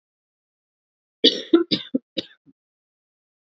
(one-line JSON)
{"cough_length": "3.5 s", "cough_amplitude": 25990, "cough_signal_mean_std_ratio": 0.24, "survey_phase": "beta (2021-08-13 to 2022-03-07)", "age": "18-44", "gender": "Female", "wearing_mask": "No", "symptom_cough_any": true, "symptom_runny_or_blocked_nose": true, "symptom_sore_throat": true, "symptom_fatigue": true, "symptom_headache": true, "symptom_change_to_sense_of_smell_or_taste": true, "symptom_onset": "4 days", "smoker_status": "Current smoker (e-cigarettes or vapes only)", "respiratory_condition_asthma": false, "respiratory_condition_other": false, "recruitment_source": "Test and Trace", "submission_delay": "2 days", "covid_test_result": "Positive", "covid_test_method": "RT-qPCR", "covid_ct_value": 18.3, "covid_ct_gene": "ORF1ab gene", "covid_ct_mean": 18.5, "covid_viral_load": "870000 copies/ml", "covid_viral_load_category": "Low viral load (10K-1M copies/ml)"}